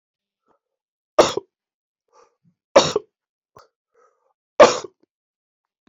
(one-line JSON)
{"three_cough_length": "5.9 s", "three_cough_amplitude": 27770, "three_cough_signal_mean_std_ratio": 0.2, "survey_phase": "beta (2021-08-13 to 2022-03-07)", "age": "18-44", "gender": "Male", "wearing_mask": "Yes", "symptom_cough_any": true, "symptom_runny_or_blocked_nose": true, "symptom_sore_throat": true, "symptom_fever_high_temperature": true, "symptom_headache": true, "smoker_status": "Never smoked", "respiratory_condition_asthma": false, "respiratory_condition_other": false, "recruitment_source": "Test and Trace", "submission_delay": "2 days", "covid_test_result": "Positive", "covid_test_method": "RT-qPCR", "covid_ct_value": 14.1, "covid_ct_gene": "ORF1ab gene", "covid_ct_mean": 14.2, "covid_viral_load": "21000000 copies/ml", "covid_viral_load_category": "High viral load (>1M copies/ml)"}